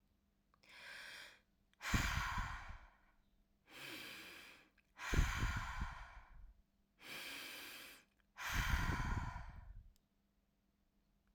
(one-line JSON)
{"exhalation_length": "11.3 s", "exhalation_amplitude": 2962, "exhalation_signal_mean_std_ratio": 0.5, "survey_phase": "alpha (2021-03-01 to 2021-08-12)", "age": "18-44", "gender": "Female", "wearing_mask": "No", "symptom_new_continuous_cough": true, "symptom_onset": "6 days", "smoker_status": "Never smoked", "respiratory_condition_asthma": false, "respiratory_condition_other": false, "recruitment_source": "REACT", "submission_delay": "2 days", "covid_test_result": "Negative", "covid_test_method": "RT-qPCR"}